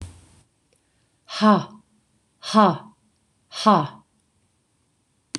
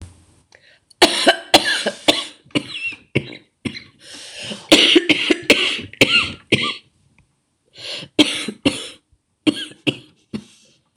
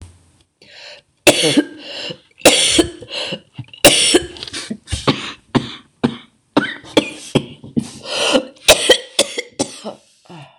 {"exhalation_length": "5.4 s", "exhalation_amplitude": 25888, "exhalation_signal_mean_std_ratio": 0.29, "cough_length": "11.0 s", "cough_amplitude": 26028, "cough_signal_mean_std_ratio": 0.41, "three_cough_length": "10.6 s", "three_cough_amplitude": 26028, "three_cough_signal_mean_std_ratio": 0.44, "survey_phase": "beta (2021-08-13 to 2022-03-07)", "age": "45-64", "gender": "Female", "wearing_mask": "No", "symptom_cough_any": true, "symptom_runny_or_blocked_nose": true, "symptom_sore_throat": true, "symptom_fatigue": true, "symptom_fever_high_temperature": true, "symptom_headache": true, "symptom_onset": "6 days", "smoker_status": "Ex-smoker", "respiratory_condition_asthma": false, "respiratory_condition_other": true, "recruitment_source": "Test and Trace", "submission_delay": "2 days", "covid_test_result": "Positive", "covid_test_method": "RT-qPCR"}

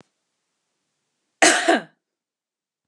{"cough_length": "2.9 s", "cough_amplitude": 28409, "cough_signal_mean_std_ratio": 0.27, "survey_phase": "beta (2021-08-13 to 2022-03-07)", "age": "45-64", "gender": "Female", "wearing_mask": "No", "symptom_cough_any": true, "symptom_runny_or_blocked_nose": true, "symptom_shortness_of_breath": true, "symptom_sore_throat": true, "symptom_fatigue": true, "symptom_headache": true, "symptom_change_to_sense_of_smell_or_taste": true, "symptom_onset": "5 days", "smoker_status": "Never smoked", "respiratory_condition_asthma": false, "respiratory_condition_other": false, "recruitment_source": "REACT", "submission_delay": "6 days", "covid_test_result": "Positive", "covid_test_method": "RT-qPCR", "covid_ct_value": 23.0, "covid_ct_gene": "E gene", "influenza_a_test_result": "Negative", "influenza_b_test_result": "Negative"}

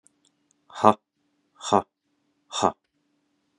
{"exhalation_length": "3.6 s", "exhalation_amplitude": 29606, "exhalation_signal_mean_std_ratio": 0.2, "survey_phase": "beta (2021-08-13 to 2022-03-07)", "age": "18-44", "gender": "Male", "wearing_mask": "No", "symptom_runny_or_blocked_nose": true, "symptom_onset": "7 days", "smoker_status": "Ex-smoker", "respiratory_condition_asthma": false, "respiratory_condition_other": false, "recruitment_source": "Test and Trace", "submission_delay": "2 days", "covid_test_result": "Positive", "covid_test_method": "RT-qPCR", "covid_ct_value": 27.8, "covid_ct_gene": "N gene"}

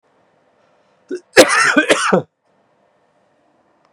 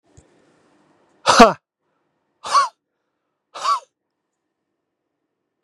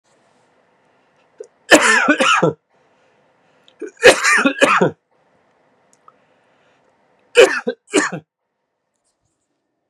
{"cough_length": "3.9 s", "cough_amplitude": 32768, "cough_signal_mean_std_ratio": 0.34, "exhalation_length": "5.6 s", "exhalation_amplitude": 32768, "exhalation_signal_mean_std_ratio": 0.23, "three_cough_length": "9.9 s", "three_cough_amplitude": 32768, "three_cough_signal_mean_std_ratio": 0.34, "survey_phase": "beta (2021-08-13 to 2022-03-07)", "age": "18-44", "gender": "Male", "wearing_mask": "No", "symptom_cough_any": true, "symptom_runny_or_blocked_nose": true, "symptom_headache": true, "symptom_change_to_sense_of_smell_or_taste": true, "smoker_status": "Never smoked", "respiratory_condition_asthma": false, "respiratory_condition_other": false, "recruitment_source": "Test and Trace", "submission_delay": "1 day", "covid_test_result": "Positive", "covid_test_method": "RT-qPCR", "covid_ct_value": 17.3, "covid_ct_gene": "ORF1ab gene", "covid_ct_mean": 17.7, "covid_viral_load": "1500000 copies/ml", "covid_viral_load_category": "High viral load (>1M copies/ml)"}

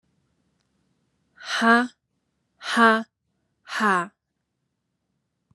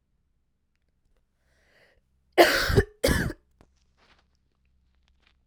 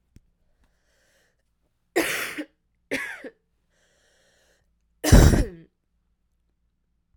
{"exhalation_length": "5.5 s", "exhalation_amplitude": 25655, "exhalation_signal_mean_std_ratio": 0.31, "cough_length": "5.5 s", "cough_amplitude": 27226, "cough_signal_mean_std_ratio": 0.26, "three_cough_length": "7.2 s", "three_cough_amplitude": 29286, "three_cough_signal_mean_std_ratio": 0.24, "survey_phase": "alpha (2021-03-01 to 2021-08-12)", "age": "18-44", "gender": "Female", "wearing_mask": "No", "symptom_cough_any": true, "symptom_fatigue": true, "symptom_fever_high_temperature": true, "symptom_headache": true, "smoker_status": "Never smoked", "respiratory_condition_asthma": true, "respiratory_condition_other": false, "recruitment_source": "Test and Trace", "submission_delay": "2 days", "covid_test_result": "Positive", "covid_test_method": "RT-qPCR", "covid_ct_value": 22.5, "covid_ct_gene": "ORF1ab gene", "covid_ct_mean": 22.9, "covid_viral_load": "32000 copies/ml", "covid_viral_load_category": "Low viral load (10K-1M copies/ml)"}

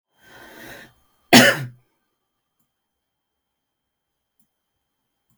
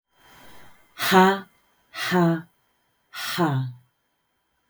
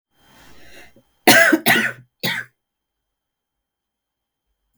{"cough_length": "5.4 s", "cough_amplitude": 32768, "cough_signal_mean_std_ratio": 0.18, "exhalation_length": "4.7 s", "exhalation_amplitude": 27820, "exhalation_signal_mean_std_ratio": 0.41, "three_cough_length": "4.8 s", "three_cough_amplitude": 32768, "three_cough_signal_mean_std_ratio": 0.3, "survey_phase": "beta (2021-08-13 to 2022-03-07)", "age": "45-64", "gender": "Female", "wearing_mask": "No", "symptom_fatigue": true, "symptom_headache": true, "smoker_status": "Current smoker (11 or more cigarettes per day)", "respiratory_condition_asthma": true, "respiratory_condition_other": false, "recruitment_source": "REACT", "submission_delay": "1 day", "covid_test_result": "Negative", "covid_test_method": "RT-qPCR"}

